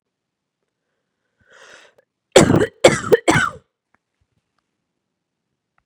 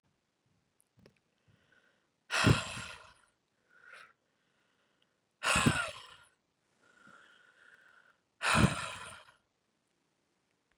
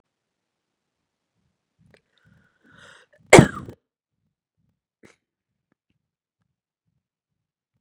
{
  "three_cough_length": "5.9 s",
  "three_cough_amplitude": 32768,
  "three_cough_signal_mean_std_ratio": 0.25,
  "exhalation_length": "10.8 s",
  "exhalation_amplitude": 7927,
  "exhalation_signal_mean_std_ratio": 0.27,
  "cough_length": "7.8 s",
  "cough_amplitude": 32768,
  "cough_signal_mean_std_ratio": 0.1,
  "survey_phase": "beta (2021-08-13 to 2022-03-07)",
  "age": "18-44",
  "gender": "Female",
  "wearing_mask": "No",
  "symptom_cough_any": true,
  "symptom_new_continuous_cough": true,
  "symptom_runny_or_blocked_nose": true,
  "symptom_sore_throat": true,
  "symptom_fatigue": true,
  "symptom_onset": "31 days",
  "smoker_status": "Never smoked",
  "respiratory_condition_asthma": true,
  "respiratory_condition_other": false,
  "recruitment_source": "Test and Trace",
  "submission_delay": "1 day",
  "covid_test_result": "Positive",
  "covid_test_method": "ePCR"
}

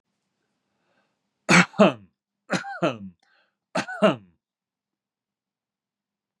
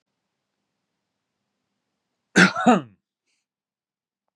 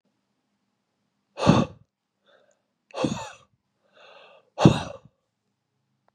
{
  "three_cough_length": "6.4 s",
  "three_cough_amplitude": 26050,
  "three_cough_signal_mean_std_ratio": 0.26,
  "cough_length": "4.4 s",
  "cough_amplitude": 28709,
  "cough_signal_mean_std_ratio": 0.22,
  "exhalation_length": "6.1 s",
  "exhalation_amplitude": 31037,
  "exhalation_signal_mean_std_ratio": 0.23,
  "survey_phase": "beta (2021-08-13 to 2022-03-07)",
  "age": "45-64",
  "gender": "Male",
  "wearing_mask": "No",
  "symptom_cough_any": true,
  "symptom_sore_throat": true,
  "smoker_status": "Ex-smoker",
  "respiratory_condition_asthma": false,
  "respiratory_condition_other": false,
  "recruitment_source": "Test and Trace",
  "submission_delay": "1 day",
  "covid_test_result": "Positive",
  "covid_test_method": "RT-qPCR",
  "covid_ct_value": 21.8,
  "covid_ct_gene": "N gene"
}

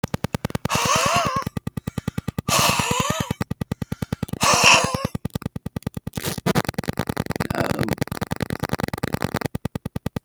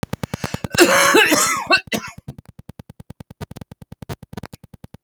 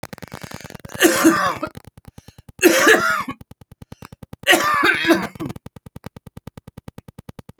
{
  "exhalation_length": "10.2 s",
  "exhalation_amplitude": 32768,
  "exhalation_signal_mean_std_ratio": 0.49,
  "cough_length": "5.0 s",
  "cough_amplitude": 32768,
  "cough_signal_mean_std_ratio": 0.41,
  "three_cough_length": "7.6 s",
  "three_cough_amplitude": 31588,
  "three_cough_signal_mean_std_ratio": 0.44,
  "survey_phase": "beta (2021-08-13 to 2022-03-07)",
  "age": "65+",
  "gender": "Male",
  "wearing_mask": "No",
  "symptom_cough_any": true,
  "symptom_runny_or_blocked_nose": true,
  "symptom_onset": "6 days",
  "smoker_status": "Ex-smoker",
  "respiratory_condition_asthma": false,
  "respiratory_condition_other": false,
  "recruitment_source": "REACT",
  "submission_delay": "0 days",
  "covid_test_result": "Negative",
  "covid_test_method": "RT-qPCR"
}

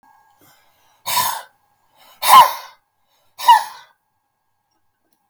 {
  "exhalation_length": "5.3 s",
  "exhalation_amplitude": 32768,
  "exhalation_signal_mean_std_ratio": 0.28,
  "survey_phase": "beta (2021-08-13 to 2022-03-07)",
  "age": "65+",
  "gender": "Male",
  "wearing_mask": "No",
  "symptom_none": true,
  "smoker_status": "Never smoked",
  "respiratory_condition_asthma": true,
  "respiratory_condition_other": false,
  "recruitment_source": "REACT",
  "submission_delay": "2 days",
  "covid_test_result": "Negative",
  "covid_test_method": "RT-qPCR",
  "influenza_a_test_result": "Negative",
  "influenza_b_test_result": "Negative"
}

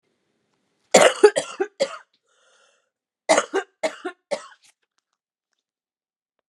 {
  "three_cough_length": "6.5 s",
  "three_cough_amplitude": 32767,
  "three_cough_signal_mean_std_ratio": 0.25,
  "survey_phase": "beta (2021-08-13 to 2022-03-07)",
  "age": "18-44",
  "gender": "Female",
  "wearing_mask": "No",
  "symptom_cough_any": true,
  "symptom_runny_or_blocked_nose": true,
  "symptom_shortness_of_breath": true,
  "symptom_sore_throat": true,
  "smoker_status": "Prefer not to say",
  "respiratory_condition_asthma": false,
  "respiratory_condition_other": false,
  "recruitment_source": "Test and Trace",
  "submission_delay": "2 days",
  "covid_test_result": "Positive",
  "covid_test_method": "RT-qPCR",
  "covid_ct_value": 25.8,
  "covid_ct_gene": "ORF1ab gene"
}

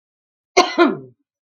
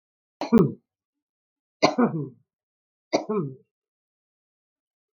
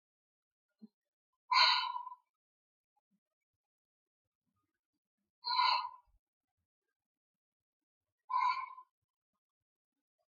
{
  "cough_length": "1.5 s",
  "cough_amplitude": 32768,
  "cough_signal_mean_std_ratio": 0.36,
  "three_cough_length": "5.1 s",
  "three_cough_amplitude": 24934,
  "three_cough_signal_mean_std_ratio": 0.29,
  "exhalation_length": "10.3 s",
  "exhalation_amplitude": 6522,
  "exhalation_signal_mean_std_ratio": 0.27,
  "survey_phase": "beta (2021-08-13 to 2022-03-07)",
  "age": "45-64",
  "gender": "Female",
  "wearing_mask": "No",
  "symptom_none": true,
  "smoker_status": "Current smoker (1 to 10 cigarettes per day)",
  "respiratory_condition_asthma": false,
  "respiratory_condition_other": false,
  "recruitment_source": "REACT",
  "submission_delay": "2 days",
  "covid_test_result": "Negative",
  "covid_test_method": "RT-qPCR",
  "influenza_a_test_result": "Unknown/Void",
  "influenza_b_test_result": "Unknown/Void"
}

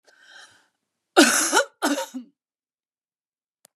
{
  "cough_length": "3.8 s",
  "cough_amplitude": 30173,
  "cough_signal_mean_std_ratio": 0.32,
  "survey_phase": "beta (2021-08-13 to 2022-03-07)",
  "age": "45-64",
  "gender": "Female",
  "wearing_mask": "No",
  "symptom_none": true,
  "smoker_status": "Never smoked",
  "respiratory_condition_asthma": false,
  "respiratory_condition_other": false,
  "recruitment_source": "REACT",
  "submission_delay": "6 days",
  "covid_test_result": "Negative",
  "covid_test_method": "RT-qPCR",
  "influenza_a_test_result": "Negative",
  "influenza_b_test_result": "Negative"
}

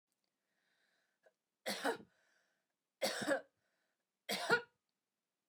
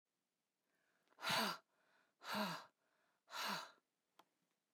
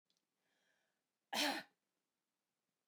{
  "three_cough_length": "5.5 s",
  "three_cough_amplitude": 3809,
  "three_cough_signal_mean_std_ratio": 0.31,
  "exhalation_length": "4.7 s",
  "exhalation_amplitude": 1446,
  "exhalation_signal_mean_std_ratio": 0.38,
  "cough_length": "2.9 s",
  "cough_amplitude": 1945,
  "cough_signal_mean_std_ratio": 0.25,
  "survey_phase": "beta (2021-08-13 to 2022-03-07)",
  "age": "45-64",
  "gender": "Female",
  "wearing_mask": "No",
  "symptom_headache": true,
  "smoker_status": "Never smoked",
  "respiratory_condition_asthma": false,
  "respiratory_condition_other": false,
  "recruitment_source": "REACT",
  "submission_delay": "3 days",
  "covid_test_result": "Negative",
  "covid_test_method": "RT-qPCR",
  "influenza_a_test_result": "Unknown/Void",
  "influenza_b_test_result": "Unknown/Void"
}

